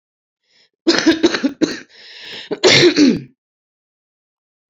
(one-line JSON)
{"cough_length": "4.7 s", "cough_amplitude": 31929, "cough_signal_mean_std_ratio": 0.42, "survey_phase": "beta (2021-08-13 to 2022-03-07)", "age": "18-44", "gender": "Female", "wearing_mask": "No", "symptom_cough_any": true, "symptom_onset": "3 days", "smoker_status": "Current smoker (e-cigarettes or vapes only)", "respiratory_condition_asthma": false, "respiratory_condition_other": false, "recruitment_source": "Test and Trace", "submission_delay": "1 day", "covid_test_result": "Negative", "covid_test_method": "RT-qPCR"}